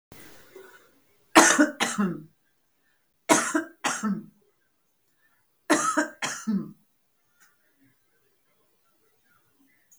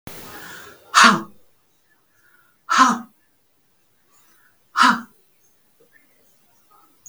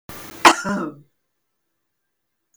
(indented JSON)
{
  "three_cough_length": "10.0 s",
  "three_cough_amplitude": 32766,
  "three_cough_signal_mean_std_ratio": 0.32,
  "exhalation_length": "7.1 s",
  "exhalation_amplitude": 32768,
  "exhalation_signal_mean_std_ratio": 0.28,
  "cough_length": "2.6 s",
  "cough_amplitude": 32768,
  "cough_signal_mean_std_ratio": 0.26,
  "survey_phase": "beta (2021-08-13 to 2022-03-07)",
  "age": "65+",
  "gender": "Female",
  "wearing_mask": "No",
  "symptom_none": true,
  "smoker_status": "Never smoked",
  "respiratory_condition_asthma": false,
  "respiratory_condition_other": false,
  "recruitment_source": "REACT",
  "submission_delay": "1 day",
  "covid_test_result": "Negative",
  "covid_test_method": "RT-qPCR",
  "influenza_a_test_result": "Negative",
  "influenza_b_test_result": "Negative"
}